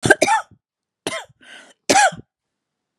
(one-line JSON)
{"cough_length": "3.0 s", "cough_amplitude": 32768, "cough_signal_mean_std_ratio": 0.35, "survey_phase": "beta (2021-08-13 to 2022-03-07)", "age": "65+", "gender": "Female", "wearing_mask": "No", "symptom_cough_any": true, "symptom_runny_or_blocked_nose": true, "symptom_onset": "11 days", "smoker_status": "Never smoked", "respiratory_condition_asthma": false, "respiratory_condition_other": false, "recruitment_source": "REACT", "submission_delay": "1 day", "covid_test_result": "Negative", "covid_test_method": "RT-qPCR", "influenza_a_test_result": "Negative", "influenza_b_test_result": "Negative"}